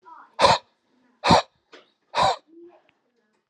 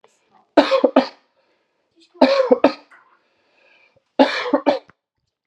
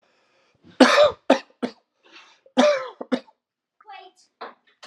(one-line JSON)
{"exhalation_length": "3.5 s", "exhalation_amplitude": 26687, "exhalation_signal_mean_std_ratio": 0.32, "three_cough_length": "5.5 s", "three_cough_amplitude": 32767, "three_cough_signal_mean_std_ratio": 0.35, "cough_length": "4.9 s", "cough_amplitude": 32471, "cough_signal_mean_std_ratio": 0.31, "survey_phase": "alpha (2021-03-01 to 2021-08-12)", "age": "18-44", "gender": "Male", "wearing_mask": "No", "symptom_none": true, "smoker_status": "Never smoked", "respiratory_condition_asthma": false, "respiratory_condition_other": false, "recruitment_source": "REACT", "submission_delay": "2 days", "covid_test_result": "Negative", "covid_test_method": "RT-qPCR"}